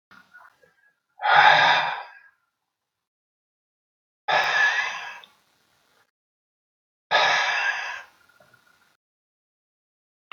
{"exhalation_length": "10.3 s", "exhalation_amplitude": 24912, "exhalation_signal_mean_std_ratio": 0.37, "survey_phase": "beta (2021-08-13 to 2022-03-07)", "age": "65+", "gender": "Male", "wearing_mask": "No", "symptom_cough_any": true, "symptom_new_continuous_cough": true, "symptom_sore_throat": true, "symptom_onset": "2 days", "smoker_status": "Ex-smoker", "respiratory_condition_asthma": false, "respiratory_condition_other": false, "recruitment_source": "Test and Trace", "submission_delay": "1 day", "covid_test_result": "Negative", "covid_test_method": "RT-qPCR"}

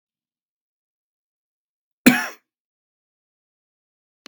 {"cough_length": "4.3 s", "cough_amplitude": 32768, "cough_signal_mean_std_ratio": 0.14, "survey_phase": "beta (2021-08-13 to 2022-03-07)", "age": "45-64", "gender": "Male", "wearing_mask": "No", "symptom_none": true, "smoker_status": "Never smoked", "respiratory_condition_asthma": false, "respiratory_condition_other": false, "recruitment_source": "REACT", "submission_delay": "2 days", "covid_test_result": "Negative", "covid_test_method": "RT-qPCR"}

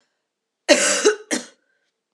{"cough_length": "2.1 s", "cough_amplitude": 32195, "cough_signal_mean_std_ratio": 0.38, "survey_phase": "beta (2021-08-13 to 2022-03-07)", "age": "18-44", "gender": "Female", "wearing_mask": "No", "symptom_cough_any": true, "symptom_runny_or_blocked_nose": true, "symptom_change_to_sense_of_smell_or_taste": true, "symptom_loss_of_taste": true, "symptom_onset": "3 days", "smoker_status": "Never smoked", "respiratory_condition_asthma": false, "respiratory_condition_other": false, "recruitment_source": "Test and Trace", "submission_delay": "2 days", "covid_test_result": "Positive", "covid_test_method": "ePCR"}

